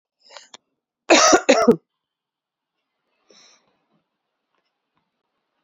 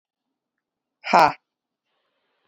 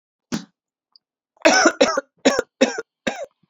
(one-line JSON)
{"cough_length": "5.6 s", "cough_amplitude": 29673, "cough_signal_mean_std_ratio": 0.25, "exhalation_length": "2.5 s", "exhalation_amplitude": 28710, "exhalation_signal_mean_std_ratio": 0.2, "three_cough_length": "3.5 s", "three_cough_amplitude": 29618, "three_cough_signal_mean_std_ratio": 0.38, "survey_phase": "alpha (2021-03-01 to 2021-08-12)", "age": "18-44", "gender": "Female", "wearing_mask": "No", "symptom_cough_any": true, "symptom_fatigue": true, "symptom_onset": "25 days", "smoker_status": "Never smoked", "respiratory_condition_asthma": false, "respiratory_condition_other": false, "recruitment_source": "Test and Trace", "submission_delay": "2 days", "covid_test_result": "Positive", "covid_test_method": "RT-qPCR", "covid_ct_value": 14.7, "covid_ct_gene": "ORF1ab gene", "covid_ct_mean": 15.0, "covid_viral_load": "12000000 copies/ml", "covid_viral_load_category": "High viral load (>1M copies/ml)"}